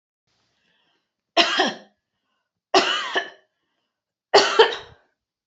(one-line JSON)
{"three_cough_length": "5.5 s", "three_cough_amplitude": 30080, "three_cough_signal_mean_std_ratio": 0.33, "survey_phase": "beta (2021-08-13 to 2022-03-07)", "age": "45-64", "gender": "Female", "wearing_mask": "No", "symptom_none": true, "smoker_status": "Never smoked", "respiratory_condition_asthma": true, "respiratory_condition_other": false, "recruitment_source": "Test and Trace", "submission_delay": "3 days", "covid_test_result": "Negative", "covid_test_method": "RT-qPCR"}